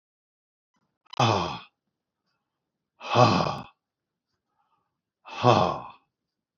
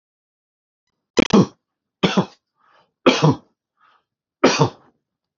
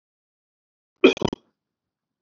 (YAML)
exhalation_length: 6.6 s
exhalation_amplitude: 22018
exhalation_signal_mean_std_ratio: 0.32
three_cough_length: 5.4 s
three_cough_amplitude: 32422
three_cough_signal_mean_std_ratio: 0.31
cough_length: 2.2 s
cough_amplitude: 26916
cough_signal_mean_std_ratio: 0.18
survey_phase: beta (2021-08-13 to 2022-03-07)
age: 65+
gender: Male
wearing_mask: 'No'
symptom_none: true
smoker_status: Never smoked
respiratory_condition_asthma: false
respiratory_condition_other: false
recruitment_source: REACT
submission_delay: 1 day
covid_test_result: Negative
covid_test_method: RT-qPCR
influenza_a_test_result: Negative
influenza_b_test_result: Negative